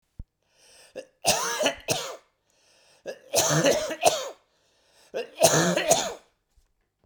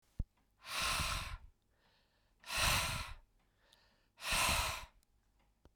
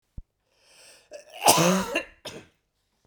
{
  "three_cough_length": "7.1 s",
  "three_cough_amplitude": 24731,
  "three_cough_signal_mean_std_ratio": 0.46,
  "exhalation_length": "5.8 s",
  "exhalation_amplitude": 3298,
  "exhalation_signal_mean_std_ratio": 0.49,
  "cough_length": "3.1 s",
  "cough_amplitude": 25331,
  "cough_signal_mean_std_ratio": 0.35,
  "survey_phase": "beta (2021-08-13 to 2022-03-07)",
  "age": "45-64",
  "gender": "Male",
  "wearing_mask": "No",
  "symptom_cough_any": true,
  "symptom_runny_or_blocked_nose": true,
  "symptom_fatigue": true,
  "symptom_headache": true,
  "smoker_status": "Never smoked",
  "respiratory_condition_asthma": false,
  "respiratory_condition_other": false,
  "recruitment_source": "Test and Trace",
  "submission_delay": "2 days",
  "covid_test_result": "Positive",
  "covid_test_method": "RT-qPCR",
  "covid_ct_value": 28.5,
  "covid_ct_gene": "ORF1ab gene"
}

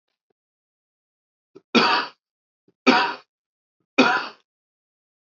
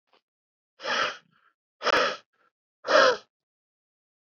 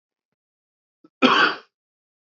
{
  "three_cough_length": "5.3 s",
  "three_cough_amplitude": 25788,
  "three_cough_signal_mean_std_ratio": 0.3,
  "exhalation_length": "4.3 s",
  "exhalation_amplitude": 17624,
  "exhalation_signal_mean_std_ratio": 0.34,
  "cough_length": "2.3 s",
  "cough_amplitude": 26093,
  "cough_signal_mean_std_ratio": 0.29,
  "survey_phase": "beta (2021-08-13 to 2022-03-07)",
  "age": "18-44",
  "gender": "Male",
  "wearing_mask": "No",
  "symptom_cough_any": true,
  "symptom_runny_or_blocked_nose": true,
  "symptom_headache": true,
  "symptom_change_to_sense_of_smell_or_taste": true,
  "symptom_loss_of_taste": true,
  "smoker_status": "Current smoker (e-cigarettes or vapes only)",
  "respiratory_condition_asthma": false,
  "respiratory_condition_other": false,
  "recruitment_source": "Test and Trace",
  "submission_delay": "2 days",
  "covid_test_result": "Positive",
  "covid_test_method": "RT-qPCR",
  "covid_ct_value": 16.6,
  "covid_ct_gene": "ORF1ab gene",
  "covid_ct_mean": 17.0,
  "covid_viral_load": "2700000 copies/ml",
  "covid_viral_load_category": "High viral load (>1M copies/ml)"
}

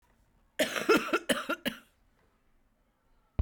{
  "cough_length": "3.4 s",
  "cough_amplitude": 8134,
  "cough_signal_mean_std_ratio": 0.36,
  "survey_phase": "beta (2021-08-13 to 2022-03-07)",
  "age": "45-64",
  "gender": "Female",
  "wearing_mask": "No",
  "symptom_cough_any": true,
  "symptom_onset": "2 days",
  "smoker_status": "Never smoked",
  "respiratory_condition_asthma": false,
  "respiratory_condition_other": false,
  "recruitment_source": "Test and Trace",
  "submission_delay": "1 day",
  "covid_test_result": "Negative",
  "covid_test_method": "RT-qPCR"
}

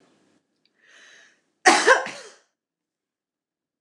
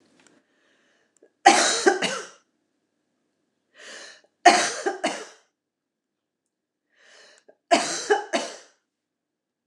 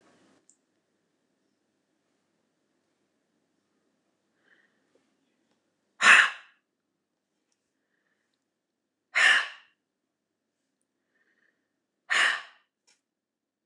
{
  "cough_length": "3.8 s",
  "cough_amplitude": 29086,
  "cough_signal_mean_std_ratio": 0.24,
  "three_cough_length": "9.7 s",
  "three_cough_amplitude": 29194,
  "three_cough_signal_mean_std_ratio": 0.3,
  "exhalation_length": "13.7 s",
  "exhalation_amplitude": 20478,
  "exhalation_signal_mean_std_ratio": 0.19,
  "survey_phase": "alpha (2021-03-01 to 2021-08-12)",
  "age": "65+",
  "gender": "Female",
  "wearing_mask": "No",
  "symptom_none": true,
  "smoker_status": "Ex-smoker",
  "respiratory_condition_asthma": false,
  "respiratory_condition_other": false,
  "recruitment_source": "REACT",
  "submission_delay": "1 day",
  "covid_test_result": "Negative",
  "covid_test_method": "RT-qPCR"
}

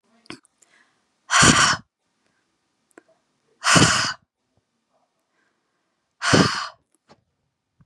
{
  "exhalation_length": "7.9 s",
  "exhalation_amplitude": 31128,
  "exhalation_signal_mean_std_ratio": 0.32,
  "survey_phase": "beta (2021-08-13 to 2022-03-07)",
  "age": "18-44",
  "gender": "Female",
  "wearing_mask": "No",
  "symptom_none": true,
  "smoker_status": "Never smoked",
  "respiratory_condition_asthma": false,
  "respiratory_condition_other": false,
  "recruitment_source": "REACT",
  "submission_delay": "2 days",
  "covid_test_result": "Negative",
  "covid_test_method": "RT-qPCR"
}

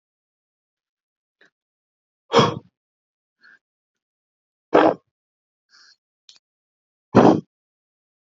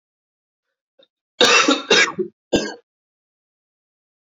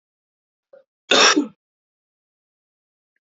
{
  "exhalation_length": "8.4 s",
  "exhalation_amplitude": 27758,
  "exhalation_signal_mean_std_ratio": 0.21,
  "three_cough_length": "4.4 s",
  "three_cough_amplitude": 28441,
  "three_cough_signal_mean_std_ratio": 0.34,
  "cough_length": "3.3 s",
  "cough_amplitude": 29669,
  "cough_signal_mean_std_ratio": 0.25,
  "survey_phase": "beta (2021-08-13 to 2022-03-07)",
  "age": "18-44",
  "gender": "Male",
  "wearing_mask": "No",
  "symptom_cough_any": true,
  "symptom_runny_or_blocked_nose": true,
  "symptom_sore_throat": true,
  "symptom_abdominal_pain": true,
  "symptom_fatigue": true,
  "symptom_fever_high_temperature": true,
  "symptom_headache": true,
  "symptom_onset": "5 days",
  "smoker_status": "Ex-smoker",
  "respiratory_condition_asthma": false,
  "respiratory_condition_other": false,
  "recruitment_source": "Test and Trace",
  "submission_delay": "2 days",
  "covid_test_result": "Positive",
  "covid_test_method": "RT-qPCR",
  "covid_ct_value": 19.5,
  "covid_ct_gene": "N gene"
}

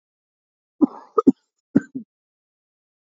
{
  "cough_length": "3.1 s",
  "cough_amplitude": 26826,
  "cough_signal_mean_std_ratio": 0.19,
  "survey_phase": "beta (2021-08-13 to 2022-03-07)",
  "age": "18-44",
  "gender": "Male",
  "wearing_mask": "No",
  "symptom_none": true,
  "smoker_status": "Never smoked",
  "respiratory_condition_asthma": true,
  "respiratory_condition_other": false,
  "recruitment_source": "Test and Trace",
  "submission_delay": "-1 day",
  "covid_test_result": "Negative",
  "covid_test_method": "LFT"
}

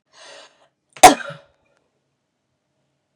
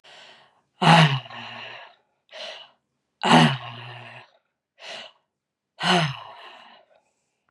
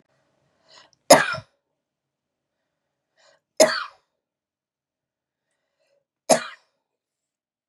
{
  "cough_length": "3.2 s",
  "cough_amplitude": 32768,
  "cough_signal_mean_std_ratio": 0.16,
  "exhalation_length": "7.5 s",
  "exhalation_amplitude": 30188,
  "exhalation_signal_mean_std_ratio": 0.33,
  "three_cough_length": "7.7 s",
  "three_cough_amplitude": 32768,
  "three_cough_signal_mean_std_ratio": 0.18,
  "survey_phase": "beta (2021-08-13 to 2022-03-07)",
  "age": "45-64",
  "gender": "Female",
  "wearing_mask": "No",
  "symptom_none": true,
  "smoker_status": "Ex-smoker",
  "respiratory_condition_asthma": false,
  "respiratory_condition_other": false,
  "recruitment_source": "REACT",
  "submission_delay": "2 days",
  "covid_test_result": "Negative",
  "covid_test_method": "RT-qPCR",
  "influenza_a_test_result": "Negative",
  "influenza_b_test_result": "Negative"
}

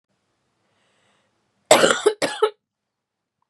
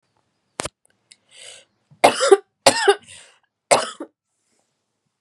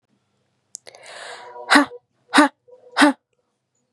{
  "cough_length": "3.5 s",
  "cough_amplitude": 32767,
  "cough_signal_mean_std_ratio": 0.28,
  "three_cough_length": "5.2 s",
  "three_cough_amplitude": 32768,
  "three_cough_signal_mean_std_ratio": 0.27,
  "exhalation_length": "3.9 s",
  "exhalation_amplitude": 32714,
  "exhalation_signal_mean_std_ratio": 0.3,
  "survey_phase": "beta (2021-08-13 to 2022-03-07)",
  "age": "18-44",
  "gender": "Female",
  "wearing_mask": "No",
  "symptom_cough_any": true,
  "symptom_sore_throat": true,
  "symptom_fatigue": true,
  "symptom_headache": true,
  "symptom_other": true,
  "smoker_status": "Never smoked",
  "respiratory_condition_asthma": false,
  "respiratory_condition_other": false,
  "recruitment_source": "Test and Trace",
  "submission_delay": "1 day",
  "covid_test_result": "Positive",
  "covid_test_method": "LFT"
}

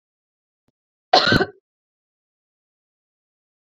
{
  "cough_length": "3.8 s",
  "cough_amplitude": 29748,
  "cough_signal_mean_std_ratio": 0.21,
  "survey_phase": "beta (2021-08-13 to 2022-03-07)",
  "age": "45-64",
  "gender": "Female",
  "wearing_mask": "No",
  "symptom_cough_any": true,
  "symptom_fatigue": true,
  "symptom_change_to_sense_of_smell_or_taste": true,
  "symptom_other": true,
  "symptom_onset": "4 days",
  "smoker_status": "Never smoked",
  "respiratory_condition_asthma": false,
  "respiratory_condition_other": false,
  "recruitment_source": "Test and Trace",
  "submission_delay": "1 day",
  "covid_test_result": "Positive",
  "covid_test_method": "RT-qPCR",
  "covid_ct_value": 18.6,
  "covid_ct_gene": "ORF1ab gene",
  "covid_ct_mean": 19.0,
  "covid_viral_load": "590000 copies/ml",
  "covid_viral_load_category": "Low viral load (10K-1M copies/ml)"
}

